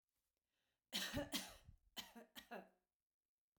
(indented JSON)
{
  "cough_length": "3.6 s",
  "cough_amplitude": 1215,
  "cough_signal_mean_std_ratio": 0.38,
  "survey_phase": "beta (2021-08-13 to 2022-03-07)",
  "age": "45-64",
  "gender": "Female",
  "wearing_mask": "No",
  "symptom_none": true,
  "smoker_status": "Ex-smoker",
  "respiratory_condition_asthma": false,
  "respiratory_condition_other": false,
  "recruitment_source": "REACT",
  "submission_delay": "1 day",
  "covid_test_result": "Negative",
  "covid_test_method": "RT-qPCR"
}